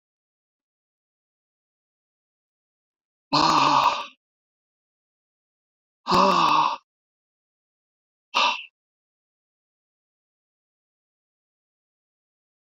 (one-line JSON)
{"exhalation_length": "12.8 s", "exhalation_amplitude": 16123, "exhalation_signal_mean_std_ratio": 0.28, "survey_phase": "beta (2021-08-13 to 2022-03-07)", "age": "45-64", "gender": "Male", "wearing_mask": "No", "symptom_none": true, "smoker_status": "Never smoked", "respiratory_condition_asthma": false, "respiratory_condition_other": true, "recruitment_source": "REACT", "submission_delay": "1 day", "covid_test_result": "Negative", "covid_test_method": "RT-qPCR", "influenza_a_test_result": "Negative", "influenza_b_test_result": "Negative"}